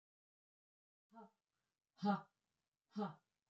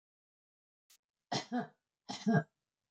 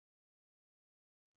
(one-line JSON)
{"exhalation_length": "3.5 s", "exhalation_amplitude": 1506, "exhalation_signal_mean_std_ratio": 0.25, "three_cough_length": "2.9 s", "three_cough_amplitude": 4175, "three_cough_signal_mean_std_ratio": 0.3, "cough_length": "1.4 s", "cough_amplitude": 4, "cough_signal_mean_std_ratio": 0.04, "survey_phase": "beta (2021-08-13 to 2022-03-07)", "age": "65+", "gender": "Female", "wearing_mask": "No", "symptom_none": true, "smoker_status": "Never smoked", "respiratory_condition_asthma": false, "respiratory_condition_other": true, "recruitment_source": "REACT", "submission_delay": "1 day", "covid_test_result": "Negative", "covid_test_method": "RT-qPCR", "influenza_a_test_result": "Negative", "influenza_b_test_result": "Negative"}